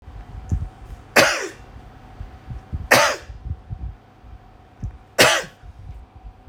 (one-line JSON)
{"cough_length": "6.5 s", "cough_amplitude": 30004, "cough_signal_mean_std_ratio": 0.41, "survey_phase": "alpha (2021-03-01 to 2021-08-12)", "age": "18-44", "gender": "Male", "wearing_mask": "No", "symptom_none": true, "smoker_status": "Never smoked", "respiratory_condition_asthma": false, "respiratory_condition_other": false, "recruitment_source": "REACT", "submission_delay": "1 day", "covid_test_result": "Negative", "covid_test_method": "RT-qPCR"}